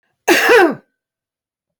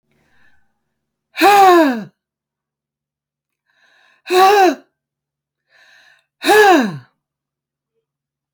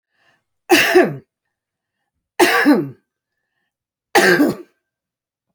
{"cough_length": "1.8 s", "cough_amplitude": 29141, "cough_signal_mean_std_ratio": 0.42, "exhalation_length": "8.5 s", "exhalation_amplitude": 31476, "exhalation_signal_mean_std_ratio": 0.36, "three_cough_length": "5.5 s", "three_cough_amplitude": 31819, "three_cough_signal_mean_std_ratio": 0.39, "survey_phase": "beta (2021-08-13 to 2022-03-07)", "age": "45-64", "gender": "Female", "wearing_mask": "No", "symptom_none": true, "smoker_status": "Never smoked", "respiratory_condition_asthma": false, "respiratory_condition_other": false, "recruitment_source": "REACT", "submission_delay": "4 days", "covid_test_result": "Negative", "covid_test_method": "RT-qPCR"}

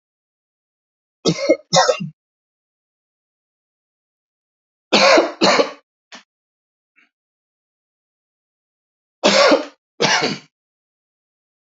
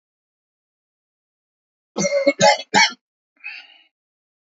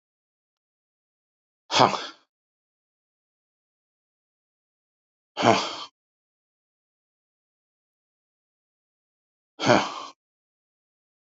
{"three_cough_length": "11.7 s", "three_cough_amplitude": 32768, "three_cough_signal_mean_std_ratio": 0.31, "cough_length": "4.5 s", "cough_amplitude": 27556, "cough_signal_mean_std_ratio": 0.3, "exhalation_length": "11.3 s", "exhalation_amplitude": 27135, "exhalation_signal_mean_std_ratio": 0.2, "survey_phase": "alpha (2021-03-01 to 2021-08-12)", "age": "65+", "gender": "Male", "wearing_mask": "No", "symptom_none": true, "smoker_status": "Never smoked", "respiratory_condition_asthma": false, "respiratory_condition_other": false, "recruitment_source": "REACT", "submission_delay": "3 days", "covid_test_result": "Negative", "covid_test_method": "RT-qPCR"}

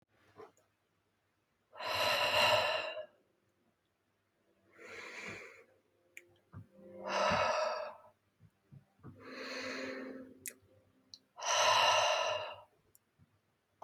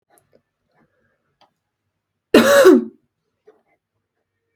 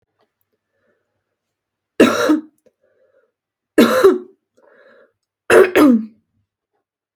{"exhalation_length": "13.8 s", "exhalation_amplitude": 4578, "exhalation_signal_mean_std_ratio": 0.45, "cough_length": "4.6 s", "cough_amplitude": 32768, "cough_signal_mean_std_ratio": 0.27, "three_cough_length": "7.2 s", "three_cough_amplitude": 32768, "three_cough_signal_mean_std_ratio": 0.34, "survey_phase": "beta (2021-08-13 to 2022-03-07)", "age": "18-44", "gender": "Female", "wearing_mask": "No", "symptom_none": true, "smoker_status": "Never smoked", "respiratory_condition_asthma": false, "respiratory_condition_other": false, "recruitment_source": "REACT", "submission_delay": "1 day", "covid_test_result": "Negative", "covid_test_method": "RT-qPCR", "influenza_a_test_result": "Negative", "influenza_b_test_result": "Negative"}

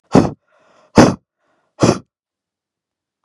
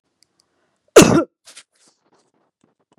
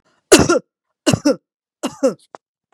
{"exhalation_length": "3.2 s", "exhalation_amplitude": 32768, "exhalation_signal_mean_std_ratio": 0.28, "cough_length": "3.0 s", "cough_amplitude": 32768, "cough_signal_mean_std_ratio": 0.22, "three_cough_length": "2.7 s", "three_cough_amplitude": 32768, "three_cough_signal_mean_std_ratio": 0.35, "survey_phase": "beta (2021-08-13 to 2022-03-07)", "age": "45-64", "gender": "Female", "wearing_mask": "No", "symptom_none": true, "smoker_status": "Never smoked", "respiratory_condition_asthma": false, "respiratory_condition_other": false, "recruitment_source": "REACT", "submission_delay": "2 days", "covid_test_result": "Negative", "covid_test_method": "RT-qPCR"}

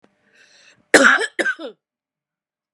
{"cough_length": "2.7 s", "cough_amplitude": 32768, "cough_signal_mean_std_ratio": 0.31, "survey_phase": "beta (2021-08-13 to 2022-03-07)", "age": "45-64", "gender": "Female", "wearing_mask": "No", "symptom_none": true, "smoker_status": "Never smoked", "respiratory_condition_asthma": false, "respiratory_condition_other": false, "recruitment_source": "REACT", "submission_delay": "0 days", "covid_test_result": "Negative", "covid_test_method": "RT-qPCR", "influenza_a_test_result": "Negative", "influenza_b_test_result": "Negative"}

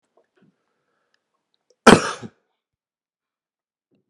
{"cough_length": "4.1 s", "cough_amplitude": 32768, "cough_signal_mean_std_ratio": 0.15, "survey_phase": "alpha (2021-03-01 to 2021-08-12)", "age": "45-64", "gender": "Male", "wearing_mask": "No", "symptom_none": true, "smoker_status": "Ex-smoker", "respiratory_condition_asthma": false, "respiratory_condition_other": false, "recruitment_source": "REACT", "submission_delay": "4 days", "covid_test_result": "Negative", "covid_test_method": "RT-qPCR"}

